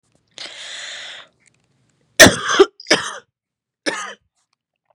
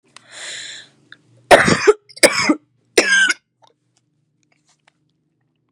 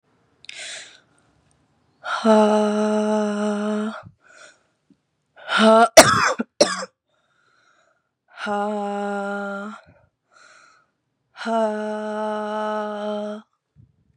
{
  "three_cough_length": "4.9 s",
  "three_cough_amplitude": 32768,
  "three_cough_signal_mean_std_ratio": 0.27,
  "cough_length": "5.7 s",
  "cough_amplitude": 32768,
  "cough_signal_mean_std_ratio": 0.33,
  "exhalation_length": "14.2 s",
  "exhalation_amplitude": 32768,
  "exhalation_signal_mean_std_ratio": 0.45,
  "survey_phase": "beta (2021-08-13 to 2022-03-07)",
  "age": "18-44",
  "gender": "Female",
  "wearing_mask": "Yes",
  "symptom_cough_any": true,
  "symptom_sore_throat": true,
  "symptom_diarrhoea": true,
  "symptom_headache": true,
  "smoker_status": "Current smoker (1 to 10 cigarettes per day)",
  "respiratory_condition_asthma": false,
  "respiratory_condition_other": false,
  "recruitment_source": "Test and Trace",
  "submission_delay": "3 days",
  "covid_test_result": "Negative",
  "covid_test_method": "RT-qPCR"
}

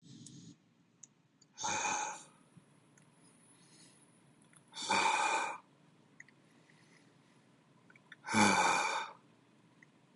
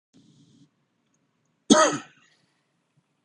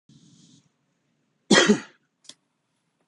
{
  "exhalation_length": "10.2 s",
  "exhalation_amplitude": 6285,
  "exhalation_signal_mean_std_ratio": 0.39,
  "three_cough_length": "3.2 s",
  "three_cough_amplitude": 27680,
  "three_cough_signal_mean_std_ratio": 0.22,
  "cough_length": "3.1 s",
  "cough_amplitude": 27127,
  "cough_signal_mean_std_ratio": 0.24,
  "survey_phase": "beta (2021-08-13 to 2022-03-07)",
  "age": "45-64",
  "gender": "Male",
  "wearing_mask": "No",
  "symptom_none": true,
  "smoker_status": "Ex-smoker",
  "respiratory_condition_asthma": true,
  "respiratory_condition_other": false,
  "recruitment_source": "REACT",
  "submission_delay": "1 day",
  "covid_test_result": "Negative",
  "covid_test_method": "RT-qPCR",
  "influenza_a_test_result": "Negative",
  "influenza_b_test_result": "Negative"
}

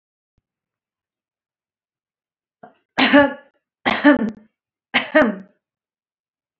{
  "three_cough_length": "6.6 s",
  "three_cough_amplitude": 27704,
  "three_cough_signal_mean_std_ratio": 0.3,
  "survey_phase": "beta (2021-08-13 to 2022-03-07)",
  "age": "18-44",
  "gender": "Female",
  "wearing_mask": "No",
  "symptom_fatigue": true,
  "symptom_onset": "12 days",
  "smoker_status": "Never smoked",
  "respiratory_condition_asthma": false,
  "respiratory_condition_other": true,
  "recruitment_source": "REACT",
  "submission_delay": "3 days",
  "covid_test_result": "Negative",
  "covid_test_method": "RT-qPCR"
}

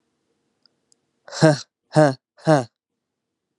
{
  "exhalation_length": "3.6 s",
  "exhalation_amplitude": 31359,
  "exhalation_signal_mean_std_ratio": 0.27,
  "survey_phase": "alpha (2021-03-01 to 2021-08-12)",
  "age": "18-44",
  "gender": "Male",
  "wearing_mask": "No",
  "symptom_shortness_of_breath": true,
  "symptom_fatigue": true,
  "symptom_fever_high_temperature": true,
  "symptom_change_to_sense_of_smell_or_taste": true,
  "symptom_onset": "4 days",
  "smoker_status": "Ex-smoker",
  "respiratory_condition_asthma": false,
  "respiratory_condition_other": false,
  "recruitment_source": "Test and Trace",
  "submission_delay": "2 days",
  "covid_test_result": "Positive",
  "covid_test_method": "RT-qPCR",
  "covid_ct_value": 11.3,
  "covid_ct_gene": "N gene",
  "covid_ct_mean": 11.7,
  "covid_viral_load": "150000000 copies/ml",
  "covid_viral_load_category": "High viral load (>1M copies/ml)"
}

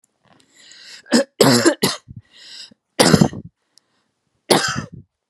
{
  "three_cough_length": "5.3 s",
  "three_cough_amplitude": 32768,
  "three_cough_signal_mean_std_ratio": 0.37,
  "survey_phase": "beta (2021-08-13 to 2022-03-07)",
  "age": "18-44",
  "gender": "Female",
  "wearing_mask": "No",
  "symptom_none": true,
  "smoker_status": "Never smoked",
  "respiratory_condition_asthma": false,
  "respiratory_condition_other": false,
  "recruitment_source": "REACT",
  "submission_delay": "1 day",
  "covid_test_result": "Negative",
  "covid_test_method": "RT-qPCR",
  "influenza_a_test_result": "Negative",
  "influenza_b_test_result": "Negative"
}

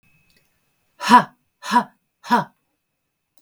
{
  "exhalation_length": "3.4 s",
  "exhalation_amplitude": 32766,
  "exhalation_signal_mean_std_ratio": 0.27,
  "survey_phase": "beta (2021-08-13 to 2022-03-07)",
  "age": "45-64",
  "gender": "Female",
  "wearing_mask": "No",
  "symptom_none": true,
  "smoker_status": "Ex-smoker",
  "respiratory_condition_asthma": false,
  "respiratory_condition_other": false,
  "recruitment_source": "REACT",
  "submission_delay": "1 day",
  "covid_test_result": "Negative",
  "covid_test_method": "RT-qPCR"
}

